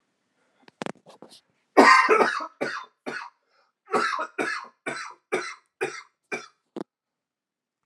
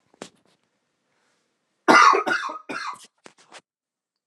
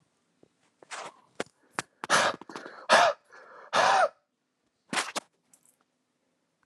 {
  "cough_length": "7.9 s",
  "cough_amplitude": 31373,
  "cough_signal_mean_std_ratio": 0.33,
  "three_cough_length": "4.3 s",
  "three_cough_amplitude": 32001,
  "three_cough_signal_mean_std_ratio": 0.29,
  "exhalation_length": "6.7 s",
  "exhalation_amplitude": 15753,
  "exhalation_signal_mean_std_ratio": 0.33,
  "survey_phase": "alpha (2021-03-01 to 2021-08-12)",
  "age": "18-44",
  "gender": "Male",
  "wearing_mask": "No",
  "symptom_cough_any": true,
  "symptom_fatigue": true,
  "symptom_change_to_sense_of_smell_or_taste": true,
  "symptom_onset": "11 days",
  "smoker_status": "Ex-smoker",
  "respiratory_condition_asthma": false,
  "respiratory_condition_other": true,
  "recruitment_source": "Test and Trace",
  "submission_delay": "4 days",
  "covid_test_result": "Positive",
  "covid_test_method": "RT-qPCR",
  "covid_ct_value": 28.1,
  "covid_ct_gene": "N gene"
}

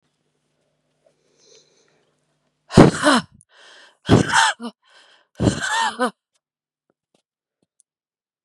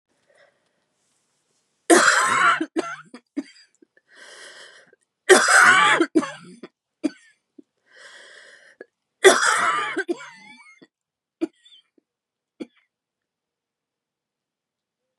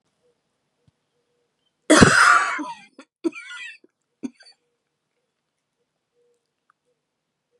{
  "exhalation_length": "8.4 s",
  "exhalation_amplitude": 32768,
  "exhalation_signal_mean_std_ratio": 0.28,
  "three_cough_length": "15.2 s",
  "three_cough_amplitude": 32767,
  "three_cough_signal_mean_std_ratio": 0.32,
  "cough_length": "7.6 s",
  "cough_amplitude": 32768,
  "cough_signal_mean_std_ratio": 0.25,
  "survey_phase": "beta (2021-08-13 to 2022-03-07)",
  "age": "18-44",
  "gender": "Female",
  "wearing_mask": "No",
  "symptom_cough_any": true,
  "symptom_new_continuous_cough": true,
  "symptom_shortness_of_breath": true,
  "symptom_sore_throat": true,
  "symptom_fatigue": true,
  "symptom_fever_high_temperature": true,
  "symptom_headache": true,
  "symptom_other": true,
  "symptom_onset": "4 days",
  "smoker_status": "Never smoked",
  "respiratory_condition_asthma": true,
  "respiratory_condition_other": false,
  "recruitment_source": "Test and Trace",
  "submission_delay": "1 day",
  "covid_test_result": "Positive",
  "covid_test_method": "ePCR"
}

